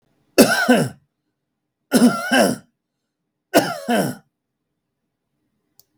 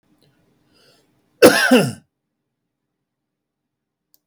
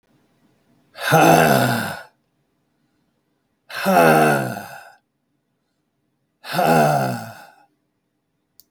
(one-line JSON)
{"three_cough_length": "6.0 s", "three_cough_amplitude": 32768, "three_cough_signal_mean_std_ratio": 0.38, "cough_length": "4.3 s", "cough_amplitude": 32768, "cough_signal_mean_std_ratio": 0.25, "exhalation_length": "8.7 s", "exhalation_amplitude": 32768, "exhalation_signal_mean_std_ratio": 0.42, "survey_phase": "beta (2021-08-13 to 2022-03-07)", "age": "65+", "gender": "Male", "wearing_mask": "No", "symptom_none": true, "smoker_status": "Never smoked", "respiratory_condition_asthma": false, "respiratory_condition_other": false, "recruitment_source": "REACT", "submission_delay": "3 days", "covid_test_result": "Negative", "covid_test_method": "RT-qPCR", "influenza_a_test_result": "Negative", "influenza_b_test_result": "Negative"}